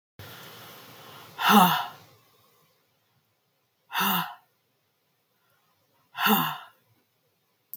{"exhalation_length": "7.8 s", "exhalation_amplitude": 17652, "exhalation_signal_mean_std_ratio": 0.31, "survey_phase": "beta (2021-08-13 to 2022-03-07)", "age": "45-64", "gender": "Female", "wearing_mask": "No", "symptom_none": true, "smoker_status": "Never smoked", "respiratory_condition_asthma": false, "respiratory_condition_other": false, "recruitment_source": "REACT", "submission_delay": "3 days", "covid_test_result": "Negative", "covid_test_method": "RT-qPCR", "influenza_a_test_result": "Negative", "influenza_b_test_result": "Negative"}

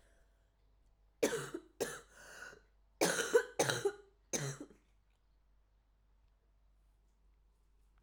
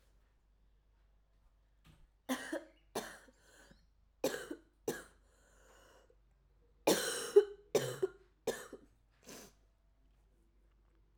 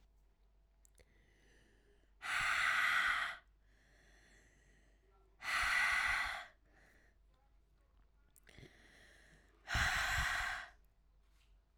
{"cough_length": "8.0 s", "cough_amplitude": 4854, "cough_signal_mean_std_ratio": 0.33, "three_cough_length": "11.2 s", "three_cough_amplitude": 6797, "three_cough_signal_mean_std_ratio": 0.26, "exhalation_length": "11.8 s", "exhalation_amplitude": 2834, "exhalation_signal_mean_std_ratio": 0.46, "survey_phase": "alpha (2021-03-01 to 2021-08-12)", "age": "18-44", "gender": "Female", "wearing_mask": "No", "symptom_cough_any": true, "symptom_new_continuous_cough": true, "symptom_fever_high_temperature": true, "symptom_headache": true, "symptom_onset": "2 days", "smoker_status": "Never smoked", "respiratory_condition_asthma": false, "respiratory_condition_other": false, "recruitment_source": "Test and Trace", "submission_delay": "1 day", "covid_test_result": "Positive", "covid_test_method": "RT-qPCR", "covid_ct_value": 13.9, "covid_ct_gene": "N gene", "covid_ct_mean": 14.6, "covid_viral_load": "17000000 copies/ml", "covid_viral_load_category": "High viral load (>1M copies/ml)"}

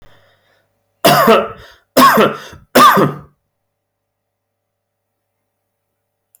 {"three_cough_length": "6.4 s", "three_cough_amplitude": 32768, "three_cough_signal_mean_std_ratio": 0.37, "survey_phase": "beta (2021-08-13 to 2022-03-07)", "age": "18-44", "gender": "Male", "wearing_mask": "No", "symptom_none": true, "smoker_status": "Ex-smoker", "respiratory_condition_asthma": false, "respiratory_condition_other": false, "recruitment_source": "REACT", "submission_delay": "5 days", "covid_test_result": "Negative", "covid_test_method": "RT-qPCR"}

